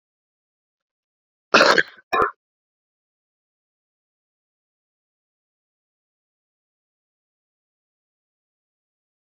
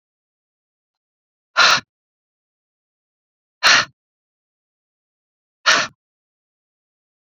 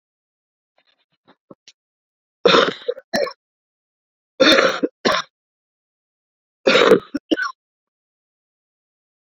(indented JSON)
{
  "cough_length": "9.3 s",
  "cough_amplitude": 28967,
  "cough_signal_mean_std_ratio": 0.16,
  "exhalation_length": "7.3 s",
  "exhalation_amplitude": 32768,
  "exhalation_signal_mean_std_ratio": 0.23,
  "three_cough_length": "9.2 s",
  "three_cough_amplitude": 32767,
  "three_cough_signal_mean_std_ratio": 0.31,
  "survey_phase": "beta (2021-08-13 to 2022-03-07)",
  "age": "45-64",
  "gender": "Female",
  "wearing_mask": "No",
  "symptom_cough_any": true,
  "symptom_abdominal_pain": true,
  "symptom_fatigue": true,
  "symptom_fever_high_temperature": true,
  "symptom_headache": true,
  "symptom_other": true,
  "symptom_onset": "5 days",
  "smoker_status": "Never smoked",
  "respiratory_condition_asthma": false,
  "respiratory_condition_other": false,
  "recruitment_source": "Test and Trace",
  "submission_delay": "3 days",
  "covid_test_result": "Positive",
  "covid_test_method": "RT-qPCR",
  "covid_ct_value": 20.4,
  "covid_ct_gene": "N gene",
  "covid_ct_mean": 21.0,
  "covid_viral_load": "130000 copies/ml",
  "covid_viral_load_category": "Low viral load (10K-1M copies/ml)"
}